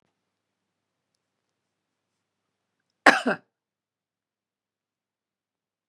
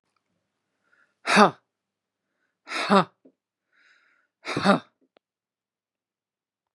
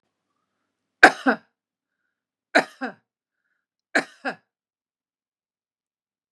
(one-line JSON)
{"cough_length": "5.9 s", "cough_amplitude": 32768, "cough_signal_mean_std_ratio": 0.13, "exhalation_length": "6.7 s", "exhalation_amplitude": 27688, "exhalation_signal_mean_std_ratio": 0.24, "three_cough_length": "6.3 s", "three_cough_amplitude": 32768, "three_cough_signal_mean_std_ratio": 0.17, "survey_phase": "beta (2021-08-13 to 2022-03-07)", "age": "45-64", "gender": "Female", "wearing_mask": "No", "symptom_none": true, "smoker_status": "Never smoked", "respiratory_condition_asthma": false, "respiratory_condition_other": false, "recruitment_source": "REACT", "submission_delay": "2 days", "covid_test_result": "Negative", "covid_test_method": "RT-qPCR", "influenza_a_test_result": "Negative", "influenza_b_test_result": "Negative"}